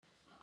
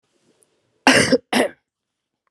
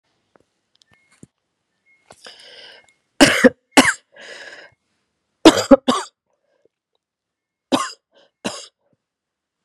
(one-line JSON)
{"exhalation_length": "0.4 s", "exhalation_amplitude": 186, "exhalation_signal_mean_std_ratio": 0.93, "cough_length": "2.3 s", "cough_amplitude": 32409, "cough_signal_mean_std_ratio": 0.34, "three_cough_length": "9.6 s", "three_cough_amplitude": 32768, "three_cough_signal_mean_std_ratio": 0.22, "survey_phase": "beta (2021-08-13 to 2022-03-07)", "age": "45-64", "gender": "Female", "wearing_mask": "No", "symptom_cough_any": true, "symptom_runny_or_blocked_nose": true, "symptom_sore_throat": true, "symptom_fatigue": true, "symptom_fever_high_temperature": true, "symptom_headache": true, "symptom_other": true, "smoker_status": "Never smoked", "respiratory_condition_asthma": false, "respiratory_condition_other": false, "recruitment_source": "Test and Trace", "submission_delay": "2 days", "covid_test_result": "Positive", "covid_test_method": "RT-qPCR", "covid_ct_value": 16.1, "covid_ct_gene": "ORF1ab gene", "covid_ct_mean": 17.2, "covid_viral_load": "2300000 copies/ml", "covid_viral_load_category": "High viral load (>1M copies/ml)"}